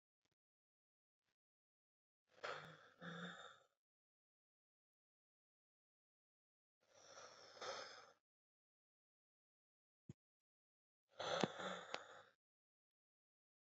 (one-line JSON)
{"exhalation_length": "13.7 s", "exhalation_amplitude": 3146, "exhalation_signal_mean_std_ratio": 0.27, "survey_phase": "beta (2021-08-13 to 2022-03-07)", "age": "18-44", "gender": "Female", "wearing_mask": "No", "symptom_none": true, "smoker_status": "Current smoker (11 or more cigarettes per day)", "respiratory_condition_asthma": true, "respiratory_condition_other": false, "recruitment_source": "REACT", "submission_delay": "2 days", "covid_test_result": "Negative", "covid_test_method": "RT-qPCR", "influenza_a_test_result": "Negative", "influenza_b_test_result": "Negative"}